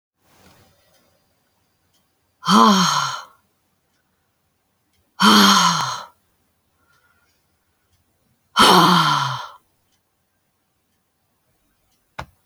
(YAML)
exhalation_length: 12.5 s
exhalation_amplitude: 30354
exhalation_signal_mean_std_ratio: 0.34
survey_phase: beta (2021-08-13 to 2022-03-07)
age: 65+
gender: Female
wearing_mask: 'No'
symptom_none: true
smoker_status: Never smoked
respiratory_condition_asthma: false
respiratory_condition_other: false
recruitment_source: REACT
submission_delay: 1 day
covid_test_result: Negative
covid_test_method: RT-qPCR